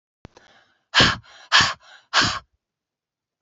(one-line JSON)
{"exhalation_length": "3.4 s", "exhalation_amplitude": 29822, "exhalation_signal_mean_std_ratio": 0.34, "survey_phase": "beta (2021-08-13 to 2022-03-07)", "age": "45-64", "gender": "Female", "wearing_mask": "No", "symptom_none": true, "smoker_status": "Never smoked", "respiratory_condition_asthma": false, "respiratory_condition_other": false, "recruitment_source": "REACT", "submission_delay": "3 days", "covid_test_result": "Negative", "covid_test_method": "RT-qPCR", "influenza_a_test_result": "Negative", "influenza_b_test_result": "Negative"}